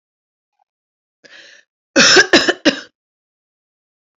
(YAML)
cough_length: 4.2 s
cough_amplitude: 32168
cough_signal_mean_std_ratio: 0.3
survey_phase: alpha (2021-03-01 to 2021-08-12)
age: 45-64
gender: Female
wearing_mask: 'No'
symptom_none: true
smoker_status: Never smoked
respiratory_condition_asthma: true
respiratory_condition_other: false
recruitment_source: REACT
submission_delay: 2 days
covid_test_result: Negative
covid_test_method: RT-qPCR